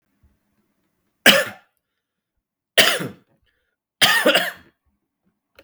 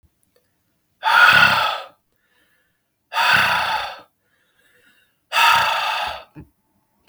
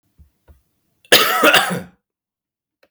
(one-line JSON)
{"three_cough_length": "5.6 s", "three_cough_amplitude": 32768, "three_cough_signal_mean_std_ratio": 0.3, "exhalation_length": "7.1 s", "exhalation_amplitude": 32231, "exhalation_signal_mean_std_ratio": 0.46, "cough_length": "2.9 s", "cough_amplitude": 32768, "cough_signal_mean_std_ratio": 0.37, "survey_phase": "beta (2021-08-13 to 2022-03-07)", "age": "18-44", "gender": "Male", "wearing_mask": "No", "symptom_cough_any": true, "symptom_new_continuous_cough": true, "symptom_onset": "10 days", "smoker_status": "Never smoked", "respiratory_condition_asthma": false, "respiratory_condition_other": false, "recruitment_source": "Test and Trace", "submission_delay": "1 day", "covid_test_result": "Positive", "covid_test_method": "RT-qPCR", "covid_ct_value": 30.5, "covid_ct_gene": "N gene", "covid_ct_mean": 30.7, "covid_viral_load": "87 copies/ml", "covid_viral_load_category": "Minimal viral load (< 10K copies/ml)"}